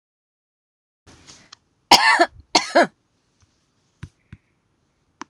{"cough_length": "5.3 s", "cough_amplitude": 26028, "cough_signal_mean_std_ratio": 0.24, "survey_phase": "alpha (2021-03-01 to 2021-08-12)", "age": "65+", "gender": "Female", "wearing_mask": "No", "symptom_none": true, "smoker_status": "Never smoked", "respiratory_condition_asthma": false, "respiratory_condition_other": false, "recruitment_source": "REACT", "submission_delay": "3 days", "covid_test_result": "Negative", "covid_test_method": "RT-qPCR"}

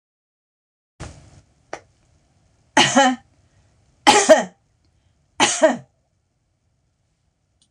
{"three_cough_length": "7.7 s", "three_cough_amplitude": 26028, "three_cough_signal_mean_std_ratio": 0.28, "survey_phase": "beta (2021-08-13 to 2022-03-07)", "age": "65+", "gender": "Female", "wearing_mask": "No", "symptom_none": true, "smoker_status": "Ex-smoker", "respiratory_condition_asthma": false, "respiratory_condition_other": false, "recruitment_source": "REACT", "submission_delay": "3 days", "covid_test_result": "Negative", "covid_test_method": "RT-qPCR"}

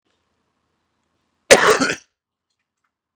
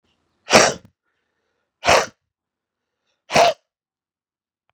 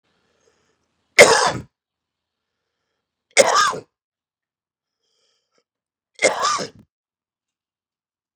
{"cough_length": "3.2 s", "cough_amplitude": 32768, "cough_signal_mean_std_ratio": 0.25, "exhalation_length": "4.7 s", "exhalation_amplitude": 32768, "exhalation_signal_mean_std_ratio": 0.27, "three_cough_length": "8.4 s", "three_cough_amplitude": 32768, "three_cough_signal_mean_std_ratio": 0.25, "survey_phase": "beta (2021-08-13 to 2022-03-07)", "age": "45-64", "gender": "Male", "wearing_mask": "No", "symptom_cough_any": true, "symptom_new_continuous_cough": true, "symptom_runny_or_blocked_nose": true, "symptom_shortness_of_breath": true, "symptom_fatigue": true, "symptom_fever_high_temperature": true, "symptom_headache": true, "symptom_change_to_sense_of_smell_or_taste": true, "symptom_loss_of_taste": true, "symptom_onset": "4 days", "smoker_status": "Never smoked", "respiratory_condition_asthma": false, "respiratory_condition_other": false, "recruitment_source": "Test and Trace", "submission_delay": "3 days", "covid_test_result": "Positive", "covid_test_method": "RT-qPCR", "covid_ct_value": 13.6, "covid_ct_gene": "ORF1ab gene", "covid_ct_mean": 13.8, "covid_viral_load": "30000000 copies/ml", "covid_viral_load_category": "High viral load (>1M copies/ml)"}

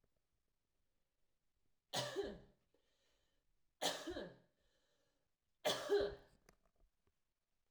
{"three_cough_length": "7.7 s", "three_cough_amplitude": 1884, "three_cough_signal_mean_std_ratio": 0.32, "survey_phase": "alpha (2021-03-01 to 2021-08-12)", "age": "18-44", "gender": "Female", "wearing_mask": "No", "symptom_none": true, "smoker_status": "Never smoked", "respiratory_condition_asthma": false, "respiratory_condition_other": false, "recruitment_source": "REACT", "submission_delay": "1 day", "covid_test_result": "Negative", "covid_test_method": "RT-qPCR"}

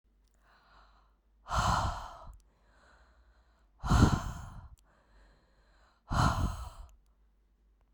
{"exhalation_length": "7.9 s", "exhalation_amplitude": 10034, "exhalation_signal_mean_std_ratio": 0.36, "survey_phase": "beta (2021-08-13 to 2022-03-07)", "age": "45-64", "gender": "Female", "wearing_mask": "No", "symptom_none": true, "smoker_status": "Current smoker (11 or more cigarettes per day)", "respiratory_condition_asthma": false, "respiratory_condition_other": false, "recruitment_source": "REACT", "submission_delay": "2 days", "covid_test_result": "Negative", "covid_test_method": "RT-qPCR"}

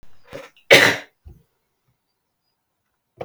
{"cough_length": "3.2 s", "cough_amplitude": 32768, "cough_signal_mean_std_ratio": 0.24, "survey_phase": "beta (2021-08-13 to 2022-03-07)", "age": "45-64", "gender": "Male", "wearing_mask": "No", "symptom_none": true, "smoker_status": "Never smoked", "respiratory_condition_asthma": false, "respiratory_condition_other": false, "recruitment_source": "REACT", "submission_delay": "2 days", "covid_test_result": "Negative", "covid_test_method": "RT-qPCR", "influenza_a_test_result": "Negative", "influenza_b_test_result": "Negative"}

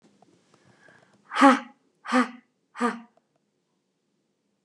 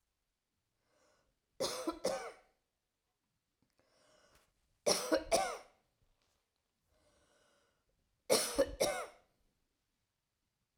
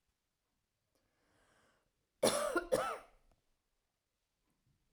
{"exhalation_length": "4.6 s", "exhalation_amplitude": 25121, "exhalation_signal_mean_std_ratio": 0.25, "three_cough_length": "10.8 s", "three_cough_amplitude": 6135, "three_cough_signal_mean_std_ratio": 0.3, "cough_length": "4.9 s", "cough_amplitude": 5228, "cough_signal_mean_std_ratio": 0.28, "survey_phase": "alpha (2021-03-01 to 2021-08-12)", "age": "65+", "gender": "Female", "wearing_mask": "No", "symptom_none": true, "smoker_status": "Never smoked", "respiratory_condition_asthma": false, "respiratory_condition_other": false, "recruitment_source": "REACT", "submission_delay": "5 days", "covid_test_result": "Negative", "covid_test_method": "RT-qPCR"}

